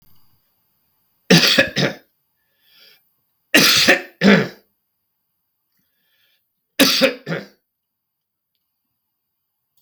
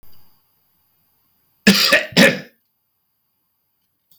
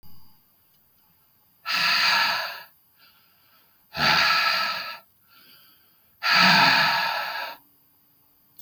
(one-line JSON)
{"three_cough_length": "9.8 s", "three_cough_amplitude": 32768, "three_cough_signal_mean_std_ratio": 0.32, "cough_length": "4.2 s", "cough_amplitude": 32768, "cough_signal_mean_std_ratio": 0.29, "exhalation_length": "8.6 s", "exhalation_amplitude": 19739, "exhalation_signal_mean_std_ratio": 0.5, "survey_phase": "beta (2021-08-13 to 2022-03-07)", "age": "65+", "gender": "Male", "wearing_mask": "No", "symptom_cough_any": true, "symptom_runny_or_blocked_nose": true, "symptom_sore_throat": true, "symptom_fatigue": true, "smoker_status": "Ex-smoker", "respiratory_condition_asthma": false, "respiratory_condition_other": false, "recruitment_source": "Test and Trace", "submission_delay": "2 days", "covid_test_result": "Positive", "covid_test_method": "LFT"}